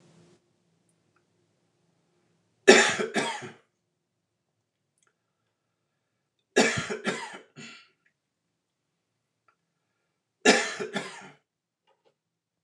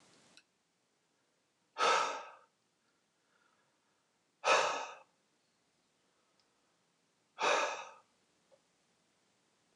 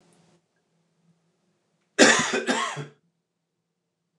three_cough_length: 12.6 s
three_cough_amplitude: 28422
three_cough_signal_mean_std_ratio: 0.23
exhalation_length: 9.8 s
exhalation_amplitude: 5595
exhalation_signal_mean_std_ratio: 0.28
cough_length: 4.2 s
cough_amplitude: 26374
cough_signal_mean_std_ratio: 0.29
survey_phase: beta (2021-08-13 to 2022-03-07)
age: 45-64
gender: Male
wearing_mask: 'No'
symptom_none: true
smoker_status: Ex-smoker
respiratory_condition_asthma: false
respiratory_condition_other: false
recruitment_source: Test and Trace
submission_delay: 1 day
covid_test_result: Positive
covid_test_method: LFT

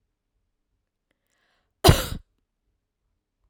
cough_length: 3.5 s
cough_amplitude: 32767
cough_signal_mean_std_ratio: 0.17
survey_phase: alpha (2021-03-01 to 2021-08-12)
age: 18-44
gender: Female
wearing_mask: 'No'
symptom_none: true
smoker_status: Ex-smoker
respiratory_condition_asthma: true
respiratory_condition_other: false
recruitment_source: REACT
submission_delay: 5 days
covid_test_result: Negative
covid_test_method: RT-qPCR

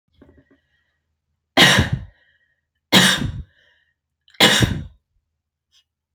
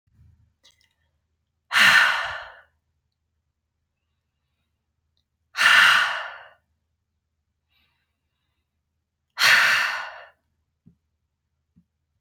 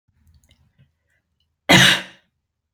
three_cough_length: 6.1 s
three_cough_amplitude: 31702
three_cough_signal_mean_std_ratio: 0.33
exhalation_length: 12.2 s
exhalation_amplitude: 23803
exhalation_signal_mean_std_ratio: 0.31
cough_length: 2.7 s
cough_amplitude: 30536
cough_signal_mean_std_ratio: 0.27
survey_phase: beta (2021-08-13 to 2022-03-07)
age: 18-44
gender: Female
wearing_mask: 'No'
symptom_none: true
smoker_status: Never smoked
respiratory_condition_asthma: false
respiratory_condition_other: false
recruitment_source: REACT
submission_delay: 1 day
covid_test_result: Negative
covid_test_method: RT-qPCR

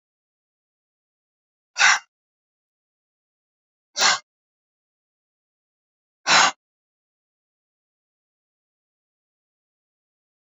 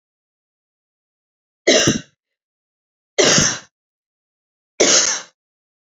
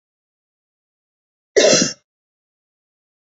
exhalation_length: 10.4 s
exhalation_amplitude: 24717
exhalation_signal_mean_std_ratio: 0.19
three_cough_length: 5.9 s
three_cough_amplitude: 32635
three_cough_signal_mean_std_ratio: 0.34
cough_length: 3.2 s
cough_amplitude: 28134
cough_signal_mean_std_ratio: 0.25
survey_phase: alpha (2021-03-01 to 2021-08-12)
age: 45-64
gender: Female
wearing_mask: 'No'
symptom_none: true
smoker_status: Ex-smoker
respiratory_condition_asthma: false
respiratory_condition_other: false
recruitment_source: REACT
submission_delay: 1 day
covid_test_result: Negative
covid_test_method: RT-qPCR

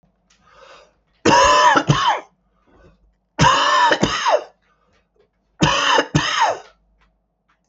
three_cough_length: 7.7 s
three_cough_amplitude: 29550
three_cough_signal_mean_std_ratio: 0.51
survey_phase: beta (2021-08-13 to 2022-03-07)
age: 65+
gender: Male
wearing_mask: 'Yes'
symptom_cough_any: true
symptom_new_continuous_cough: true
symptom_runny_or_blocked_nose: true
symptom_sore_throat: true
symptom_fatigue: true
symptom_onset: 4 days
smoker_status: Ex-smoker
respiratory_condition_asthma: false
respiratory_condition_other: false
recruitment_source: Test and Trace
submission_delay: 2 days
covid_test_result: Positive
covid_test_method: RT-qPCR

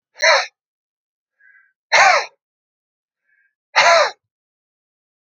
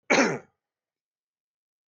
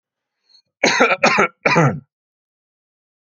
exhalation_length: 5.3 s
exhalation_amplitude: 31625
exhalation_signal_mean_std_ratio: 0.33
cough_length: 1.9 s
cough_amplitude: 14881
cough_signal_mean_std_ratio: 0.28
three_cough_length: 3.3 s
three_cough_amplitude: 32767
three_cough_signal_mean_std_ratio: 0.41
survey_phase: alpha (2021-03-01 to 2021-08-12)
age: 45-64
gender: Male
wearing_mask: 'No'
symptom_none: true
smoker_status: Never smoked
respiratory_condition_asthma: false
respiratory_condition_other: false
recruitment_source: REACT
submission_delay: 1 day
covid_test_result: Negative
covid_test_method: RT-qPCR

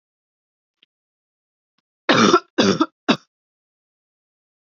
cough_length: 4.8 s
cough_amplitude: 28735
cough_signal_mean_std_ratio: 0.28
survey_phase: beta (2021-08-13 to 2022-03-07)
age: 45-64
gender: Female
wearing_mask: 'No'
symptom_cough_any: true
symptom_new_continuous_cough: true
symptom_runny_or_blocked_nose: true
symptom_fatigue: true
symptom_headache: true
symptom_change_to_sense_of_smell_or_taste: true
symptom_loss_of_taste: true
smoker_status: Never smoked
respiratory_condition_asthma: true
respiratory_condition_other: false
recruitment_source: Test and Trace
submission_delay: 2 days
covid_test_result: Positive
covid_test_method: ePCR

